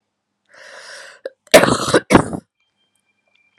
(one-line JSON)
{"cough_length": "3.6 s", "cough_amplitude": 32768, "cough_signal_mean_std_ratio": 0.3, "survey_phase": "alpha (2021-03-01 to 2021-08-12)", "age": "18-44", "gender": "Female", "wearing_mask": "No", "symptom_cough_any": true, "symptom_new_continuous_cough": true, "symptom_shortness_of_breath": true, "symptom_fatigue": true, "symptom_fever_high_temperature": true, "symptom_headache": true, "symptom_change_to_sense_of_smell_or_taste": true, "symptom_onset": "3 days", "smoker_status": "Never smoked", "respiratory_condition_asthma": true, "respiratory_condition_other": false, "recruitment_source": "Test and Trace", "submission_delay": "2 days", "covid_test_result": "Positive", "covid_test_method": "RT-qPCR", "covid_ct_value": 12.6, "covid_ct_gene": "N gene", "covid_ct_mean": 13.6, "covid_viral_load": "34000000 copies/ml", "covid_viral_load_category": "High viral load (>1M copies/ml)"}